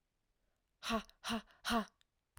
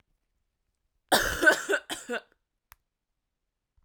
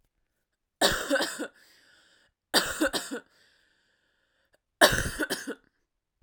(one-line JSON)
{"exhalation_length": "2.4 s", "exhalation_amplitude": 1960, "exhalation_signal_mean_std_ratio": 0.39, "cough_length": "3.8 s", "cough_amplitude": 16120, "cough_signal_mean_std_ratio": 0.31, "three_cough_length": "6.2 s", "three_cough_amplitude": 22854, "three_cough_signal_mean_std_ratio": 0.35, "survey_phase": "alpha (2021-03-01 to 2021-08-12)", "age": "18-44", "gender": "Female", "wearing_mask": "No", "symptom_cough_any": true, "symptom_onset": "3 days", "smoker_status": "Current smoker (e-cigarettes or vapes only)", "respiratory_condition_asthma": false, "respiratory_condition_other": false, "recruitment_source": "REACT", "submission_delay": "3 days", "covid_test_result": "Negative", "covid_test_method": "RT-qPCR"}